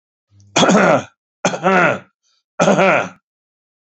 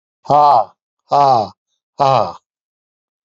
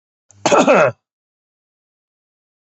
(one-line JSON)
{"three_cough_length": "3.9 s", "three_cough_amplitude": 32767, "three_cough_signal_mean_std_ratio": 0.49, "exhalation_length": "3.2 s", "exhalation_amplitude": 28679, "exhalation_signal_mean_std_ratio": 0.46, "cough_length": "2.7 s", "cough_amplitude": 28616, "cough_signal_mean_std_ratio": 0.32, "survey_phase": "beta (2021-08-13 to 2022-03-07)", "age": "65+", "gender": "Male", "wearing_mask": "No", "symptom_none": true, "smoker_status": "Ex-smoker", "respiratory_condition_asthma": false, "respiratory_condition_other": false, "recruitment_source": "REACT", "submission_delay": "0 days", "covid_test_result": "Negative", "covid_test_method": "RT-qPCR"}